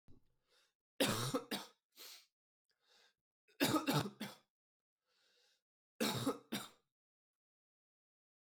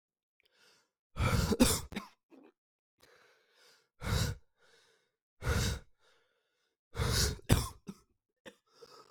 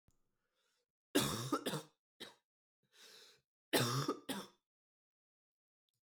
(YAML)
three_cough_length: 8.5 s
three_cough_amplitude: 3117
three_cough_signal_mean_std_ratio: 0.34
exhalation_length: 9.1 s
exhalation_amplitude: 9900
exhalation_signal_mean_std_ratio: 0.37
cough_length: 6.0 s
cough_amplitude: 3474
cough_signal_mean_std_ratio: 0.34
survey_phase: alpha (2021-03-01 to 2021-08-12)
age: 18-44
gender: Male
wearing_mask: 'No'
symptom_cough_any: true
symptom_new_continuous_cough: true
symptom_fatigue: true
symptom_fever_high_temperature: true
symptom_headache: true
symptom_onset: 2 days
smoker_status: Current smoker (e-cigarettes or vapes only)
respiratory_condition_asthma: false
respiratory_condition_other: false
recruitment_source: Test and Trace
submission_delay: 2 days
covid_test_result: Positive
covid_test_method: RT-qPCR
covid_ct_value: 18.1
covid_ct_gene: ORF1ab gene
covid_ct_mean: 19.2
covid_viral_load: 490000 copies/ml
covid_viral_load_category: Low viral load (10K-1M copies/ml)